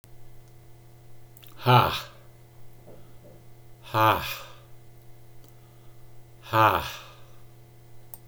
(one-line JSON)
{"exhalation_length": "8.3 s", "exhalation_amplitude": 19601, "exhalation_signal_mean_std_ratio": 0.38, "survey_phase": "beta (2021-08-13 to 2022-03-07)", "age": "65+", "gender": "Male", "wearing_mask": "No", "symptom_none": true, "smoker_status": "Ex-smoker", "respiratory_condition_asthma": false, "respiratory_condition_other": false, "recruitment_source": "REACT", "submission_delay": "2 days", "covid_test_result": "Negative", "covid_test_method": "RT-qPCR", "influenza_a_test_result": "Negative", "influenza_b_test_result": "Negative"}